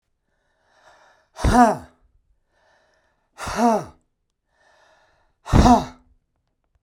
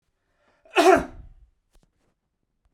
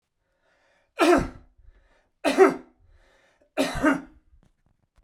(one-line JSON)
{"exhalation_length": "6.8 s", "exhalation_amplitude": 32767, "exhalation_signal_mean_std_ratio": 0.3, "cough_length": "2.7 s", "cough_amplitude": 20397, "cough_signal_mean_std_ratio": 0.26, "three_cough_length": "5.0 s", "three_cough_amplitude": 19768, "three_cough_signal_mean_std_ratio": 0.33, "survey_phase": "beta (2021-08-13 to 2022-03-07)", "age": "45-64", "gender": "Male", "wearing_mask": "No", "symptom_none": true, "smoker_status": "Never smoked", "respiratory_condition_asthma": false, "respiratory_condition_other": false, "recruitment_source": "REACT", "submission_delay": "1 day", "covid_test_result": "Negative", "covid_test_method": "RT-qPCR", "influenza_a_test_result": "Negative", "influenza_b_test_result": "Negative"}